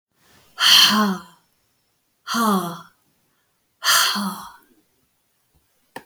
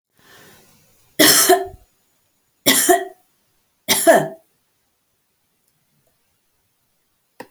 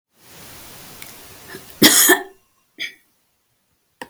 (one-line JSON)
{"exhalation_length": "6.1 s", "exhalation_amplitude": 32054, "exhalation_signal_mean_std_ratio": 0.4, "three_cough_length": "7.5 s", "three_cough_amplitude": 32768, "three_cough_signal_mean_std_ratio": 0.31, "cough_length": "4.1 s", "cough_amplitude": 32768, "cough_signal_mean_std_ratio": 0.29, "survey_phase": "alpha (2021-03-01 to 2021-08-12)", "age": "65+", "gender": "Female", "wearing_mask": "No", "symptom_none": true, "smoker_status": "Never smoked", "respiratory_condition_asthma": false, "respiratory_condition_other": false, "recruitment_source": "REACT", "submission_delay": "1 day", "covid_test_result": "Negative", "covid_test_method": "RT-qPCR"}